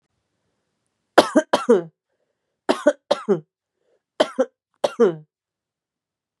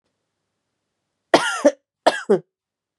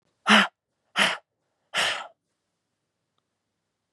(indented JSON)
{
  "three_cough_length": "6.4 s",
  "three_cough_amplitude": 32768,
  "three_cough_signal_mean_std_ratio": 0.29,
  "cough_length": "3.0 s",
  "cough_amplitude": 32543,
  "cough_signal_mean_std_ratio": 0.29,
  "exhalation_length": "3.9 s",
  "exhalation_amplitude": 23165,
  "exhalation_signal_mean_std_ratio": 0.29,
  "survey_phase": "beta (2021-08-13 to 2022-03-07)",
  "age": "18-44",
  "gender": "Female",
  "wearing_mask": "Yes",
  "symptom_sore_throat": true,
  "symptom_headache": true,
  "smoker_status": "Ex-smoker",
  "respiratory_condition_asthma": false,
  "respiratory_condition_other": false,
  "recruitment_source": "Test and Trace",
  "submission_delay": "1 day",
  "covid_test_result": "Positive",
  "covid_test_method": "RT-qPCR"
}